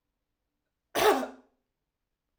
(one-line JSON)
{"cough_length": "2.4 s", "cough_amplitude": 9754, "cough_signal_mean_std_ratio": 0.28, "survey_phase": "beta (2021-08-13 to 2022-03-07)", "age": "45-64", "gender": "Female", "wearing_mask": "No", "symptom_cough_any": true, "symptom_fatigue": true, "symptom_change_to_sense_of_smell_or_taste": true, "symptom_loss_of_taste": true, "symptom_onset": "4 days", "smoker_status": "Ex-smoker", "respiratory_condition_asthma": false, "respiratory_condition_other": false, "recruitment_source": "Test and Trace", "submission_delay": "2 days", "covid_test_result": "Positive", "covid_test_method": "RT-qPCR", "covid_ct_value": 16.8, "covid_ct_gene": "ORF1ab gene", "covid_ct_mean": 17.3, "covid_viral_load": "2100000 copies/ml", "covid_viral_load_category": "High viral load (>1M copies/ml)"}